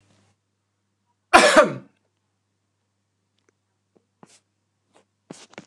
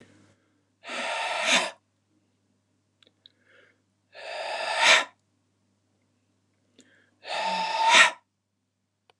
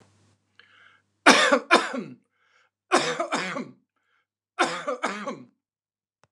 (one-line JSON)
{"cough_length": "5.7 s", "cough_amplitude": 29204, "cough_signal_mean_std_ratio": 0.19, "exhalation_length": "9.2 s", "exhalation_amplitude": 25629, "exhalation_signal_mean_std_ratio": 0.35, "three_cough_length": "6.3 s", "three_cough_amplitude": 29203, "three_cough_signal_mean_std_ratio": 0.35, "survey_phase": "beta (2021-08-13 to 2022-03-07)", "age": "45-64", "gender": "Male", "wearing_mask": "No", "symptom_cough_any": true, "smoker_status": "Never smoked", "respiratory_condition_asthma": true, "respiratory_condition_other": false, "recruitment_source": "REACT", "submission_delay": "2 days", "covid_test_result": "Negative", "covid_test_method": "RT-qPCR", "influenza_a_test_result": "Negative", "influenza_b_test_result": "Negative"}